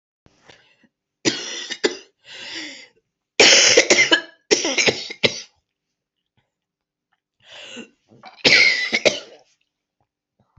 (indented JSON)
{
  "three_cough_length": "10.6 s",
  "three_cough_amplitude": 31776,
  "three_cough_signal_mean_std_ratio": 0.36,
  "survey_phase": "alpha (2021-03-01 to 2021-08-12)",
  "age": "18-44",
  "gender": "Female",
  "wearing_mask": "No",
  "symptom_cough_any": true,
  "symptom_new_continuous_cough": true,
  "symptom_abdominal_pain": true,
  "symptom_diarrhoea": true,
  "symptom_fever_high_temperature": true,
  "smoker_status": "Ex-smoker",
  "respiratory_condition_asthma": false,
  "respiratory_condition_other": false,
  "recruitment_source": "Test and Trace",
  "submission_delay": "1 day",
  "covid_test_result": "Positive",
  "covid_test_method": "RT-qPCR",
  "covid_ct_value": 17.6,
  "covid_ct_gene": "ORF1ab gene",
  "covid_ct_mean": 18.0,
  "covid_viral_load": "1200000 copies/ml",
  "covid_viral_load_category": "High viral load (>1M copies/ml)"
}